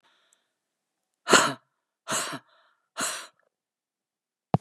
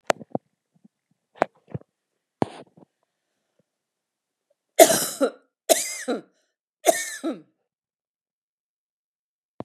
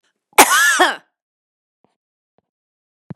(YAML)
exhalation_length: 4.6 s
exhalation_amplitude: 27372
exhalation_signal_mean_std_ratio: 0.26
three_cough_length: 9.6 s
three_cough_amplitude: 32768
three_cough_signal_mean_std_ratio: 0.22
cough_length: 3.2 s
cough_amplitude: 32768
cough_signal_mean_std_ratio: 0.31
survey_phase: beta (2021-08-13 to 2022-03-07)
age: 45-64
gender: Female
wearing_mask: 'No'
symptom_none: true
smoker_status: Never smoked
respiratory_condition_asthma: false
respiratory_condition_other: false
recruitment_source: REACT
submission_delay: 3 days
covid_test_result: Negative
covid_test_method: RT-qPCR
influenza_a_test_result: Negative
influenza_b_test_result: Negative